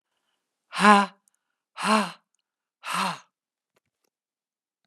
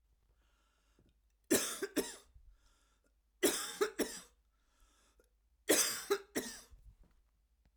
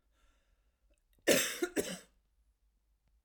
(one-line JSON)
{"exhalation_length": "4.9 s", "exhalation_amplitude": 25262, "exhalation_signal_mean_std_ratio": 0.28, "three_cough_length": "7.8 s", "three_cough_amplitude": 4863, "three_cough_signal_mean_std_ratio": 0.34, "cough_length": "3.2 s", "cough_amplitude": 7743, "cough_signal_mean_std_ratio": 0.3, "survey_phase": "alpha (2021-03-01 to 2021-08-12)", "age": "45-64", "gender": "Female", "wearing_mask": "No", "symptom_cough_any": true, "smoker_status": "Never smoked", "respiratory_condition_asthma": false, "respiratory_condition_other": false, "recruitment_source": "REACT", "submission_delay": "2 days", "covid_test_result": "Negative", "covid_test_method": "RT-qPCR"}